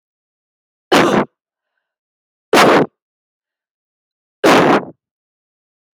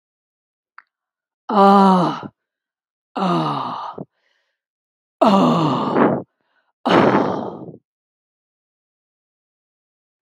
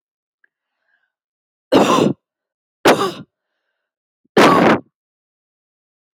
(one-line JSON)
{"cough_length": "5.9 s", "cough_amplitude": 31468, "cough_signal_mean_std_ratio": 0.34, "exhalation_length": "10.2 s", "exhalation_amplitude": 28699, "exhalation_signal_mean_std_ratio": 0.42, "three_cough_length": "6.1 s", "three_cough_amplitude": 32768, "three_cough_signal_mean_std_ratio": 0.33, "survey_phase": "alpha (2021-03-01 to 2021-08-12)", "age": "45-64", "gender": "Female", "wearing_mask": "No", "symptom_none": true, "smoker_status": "Never smoked", "respiratory_condition_asthma": false, "respiratory_condition_other": false, "recruitment_source": "REACT", "submission_delay": "3 days", "covid_test_result": "Negative", "covid_test_method": "RT-qPCR"}